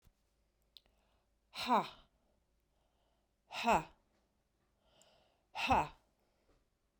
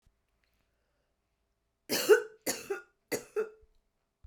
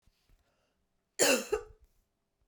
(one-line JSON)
{"exhalation_length": "7.0 s", "exhalation_amplitude": 3663, "exhalation_signal_mean_std_ratio": 0.27, "three_cough_length": "4.3 s", "three_cough_amplitude": 10213, "three_cough_signal_mean_std_ratio": 0.27, "cough_length": "2.5 s", "cough_amplitude": 8140, "cough_signal_mean_std_ratio": 0.29, "survey_phase": "beta (2021-08-13 to 2022-03-07)", "age": "45-64", "gender": "Female", "wearing_mask": "No", "symptom_cough_any": true, "symptom_runny_or_blocked_nose": true, "symptom_sore_throat": true, "symptom_fatigue": true, "symptom_fever_high_temperature": true, "symptom_headache": true, "symptom_other": true, "symptom_onset": "3 days", "smoker_status": "Never smoked", "respiratory_condition_asthma": false, "respiratory_condition_other": false, "recruitment_source": "Test and Trace", "submission_delay": "2 days", "covid_test_result": "Positive", "covid_test_method": "RT-qPCR", "covid_ct_value": 17.1, "covid_ct_gene": "ORF1ab gene", "covid_ct_mean": 17.5, "covid_viral_load": "1900000 copies/ml", "covid_viral_load_category": "High viral load (>1M copies/ml)"}